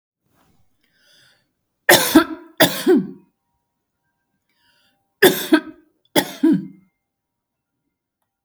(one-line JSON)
{"cough_length": "8.4 s", "cough_amplitude": 32768, "cough_signal_mean_std_ratio": 0.3, "survey_phase": "beta (2021-08-13 to 2022-03-07)", "age": "45-64", "gender": "Female", "wearing_mask": "No", "symptom_none": true, "smoker_status": "Never smoked", "respiratory_condition_asthma": false, "respiratory_condition_other": false, "recruitment_source": "REACT", "submission_delay": "3 days", "covid_test_result": "Negative", "covid_test_method": "RT-qPCR", "influenza_a_test_result": "Negative", "influenza_b_test_result": "Negative"}